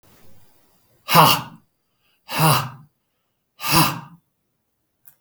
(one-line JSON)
{"exhalation_length": "5.2 s", "exhalation_amplitude": 32768, "exhalation_signal_mean_std_ratio": 0.34, "survey_phase": "beta (2021-08-13 to 2022-03-07)", "age": "65+", "gender": "Male", "wearing_mask": "No", "symptom_none": true, "smoker_status": "Ex-smoker", "respiratory_condition_asthma": false, "respiratory_condition_other": false, "recruitment_source": "REACT", "submission_delay": "4 days", "covid_test_result": "Negative", "covid_test_method": "RT-qPCR", "influenza_a_test_result": "Negative", "influenza_b_test_result": "Negative"}